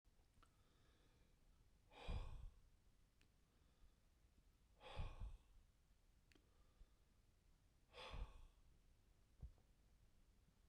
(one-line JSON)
{"exhalation_length": "10.7 s", "exhalation_amplitude": 402, "exhalation_signal_mean_std_ratio": 0.44, "survey_phase": "beta (2021-08-13 to 2022-03-07)", "age": "45-64", "gender": "Male", "wearing_mask": "No", "symptom_none": true, "smoker_status": "Ex-smoker", "respiratory_condition_asthma": false, "respiratory_condition_other": false, "recruitment_source": "REACT", "submission_delay": "1 day", "covid_test_result": "Negative", "covid_test_method": "RT-qPCR"}